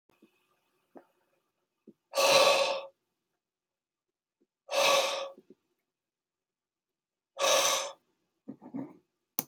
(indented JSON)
{
  "exhalation_length": "9.5 s",
  "exhalation_amplitude": 14231,
  "exhalation_signal_mean_std_ratio": 0.35,
  "survey_phase": "beta (2021-08-13 to 2022-03-07)",
  "age": "45-64",
  "gender": "Male",
  "wearing_mask": "No",
  "symptom_none": true,
  "smoker_status": "Never smoked",
  "respiratory_condition_asthma": false,
  "respiratory_condition_other": false,
  "recruitment_source": "REACT",
  "submission_delay": "2 days",
  "covid_test_result": "Negative",
  "covid_test_method": "RT-qPCR",
  "influenza_a_test_result": "Negative",
  "influenza_b_test_result": "Negative"
}